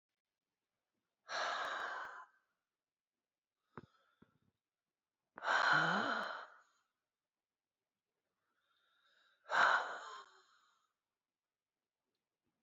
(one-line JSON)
{"exhalation_length": "12.6 s", "exhalation_amplitude": 3649, "exhalation_signal_mean_std_ratio": 0.32, "survey_phase": "beta (2021-08-13 to 2022-03-07)", "age": "65+", "gender": "Female", "wearing_mask": "No", "symptom_cough_any": true, "symptom_shortness_of_breath": true, "smoker_status": "Ex-smoker", "respiratory_condition_asthma": false, "respiratory_condition_other": false, "recruitment_source": "REACT", "submission_delay": "2 days", "covid_test_result": "Negative", "covid_test_method": "RT-qPCR"}